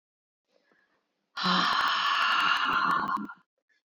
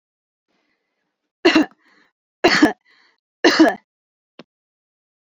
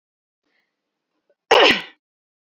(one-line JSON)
{"exhalation_length": "3.9 s", "exhalation_amplitude": 8730, "exhalation_signal_mean_std_ratio": 0.65, "three_cough_length": "5.3 s", "three_cough_amplitude": 29508, "three_cough_signal_mean_std_ratio": 0.29, "cough_length": "2.6 s", "cough_amplitude": 28884, "cough_signal_mean_std_ratio": 0.25, "survey_phase": "beta (2021-08-13 to 2022-03-07)", "age": "18-44", "gender": "Female", "wearing_mask": "No", "symptom_fatigue": true, "smoker_status": "Never smoked", "respiratory_condition_asthma": false, "respiratory_condition_other": false, "recruitment_source": "Test and Trace", "submission_delay": "2 days", "covid_test_result": "Positive", "covid_test_method": "RT-qPCR"}